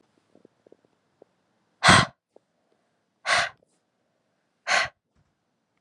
{"exhalation_length": "5.8 s", "exhalation_amplitude": 27630, "exhalation_signal_mean_std_ratio": 0.24, "survey_phase": "alpha (2021-03-01 to 2021-08-12)", "age": "18-44", "gender": "Female", "wearing_mask": "No", "symptom_cough_any": true, "symptom_new_continuous_cough": true, "symptom_fatigue": true, "symptom_fever_high_temperature": true, "symptom_headache": true, "symptom_onset": "3 days", "smoker_status": "Prefer not to say", "respiratory_condition_asthma": false, "respiratory_condition_other": false, "recruitment_source": "Test and Trace", "submission_delay": "1 day", "covid_test_result": "Positive", "covid_test_method": "RT-qPCR"}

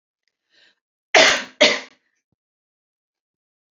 {"cough_length": "3.8 s", "cough_amplitude": 30867, "cough_signal_mean_std_ratio": 0.26, "survey_phase": "beta (2021-08-13 to 2022-03-07)", "age": "18-44", "gender": "Female", "wearing_mask": "No", "symptom_cough_any": true, "symptom_new_continuous_cough": true, "symptom_runny_or_blocked_nose": true, "symptom_shortness_of_breath": true, "symptom_sore_throat": true, "symptom_onset": "8 days", "smoker_status": "Never smoked", "respiratory_condition_asthma": false, "respiratory_condition_other": false, "recruitment_source": "REACT", "submission_delay": "0 days", "covid_test_result": "Positive", "covid_test_method": "RT-qPCR", "covid_ct_value": 24.6, "covid_ct_gene": "E gene", "influenza_a_test_result": "Negative", "influenza_b_test_result": "Negative"}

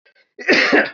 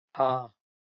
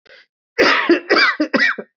{"cough_length": "0.9 s", "cough_amplitude": 25334, "cough_signal_mean_std_ratio": 0.58, "exhalation_length": "0.9 s", "exhalation_amplitude": 8367, "exhalation_signal_mean_std_ratio": 0.4, "three_cough_length": "2.0 s", "three_cough_amplitude": 25549, "three_cough_signal_mean_std_ratio": 0.62, "survey_phase": "beta (2021-08-13 to 2022-03-07)", "age": "45-64", "gender": "Male", "wearing_mask": "Yes", "symptom_cough_any": true, "symptom_runny_or_blocked_nose": true, "symptom_fatigue": true, "symptom_fever_high_temperature": true, "symptom_headache": true, "symptom_onset": "2 days", "smoker_status": "Never smoked", "respiratory_condition_asthma": false, "respiratory_condition_other": false, "recruitment_source": "Test and Trace", "submission_delay": "2 days", "covid_test_result": "Positive", "covid_test_method": "RT-qPCR"}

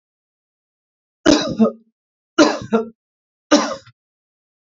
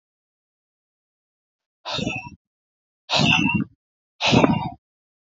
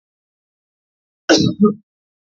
{"three_cough_length": "4.6 s", "three_cough_amplitude": 31462, "three_cough_signal_mean_std_ratio": 0.33, "exhalation_length": "5.3 s", "exhalation_amplitude": 30629, "exhalation_signal_mean_std_ratio": 0.38, "cough_length": "2.4 s", "cough_amplitude": 31224, "cough_signal_mean_std_ratio": 0.31, "survey_phase": "beta (2021-08-13 to 2022-03-07)", "age": "18-44", "gender": "Male", "wearing_mask": "No", "symptom_none": true, "smoker_status": "Current smoker (1 to 10 cigarettes per day)", "respiratory_condition_asthma": false, "respiratory_condition_other": false, "recruitment_source": "REACT", "submission_delay": "1 day", "covid_test_result": "Negative", "covid_test_method": "RT-qPCR", "influenza_a_test_result": "Negative", "influenza_b_test_result": "Negative"}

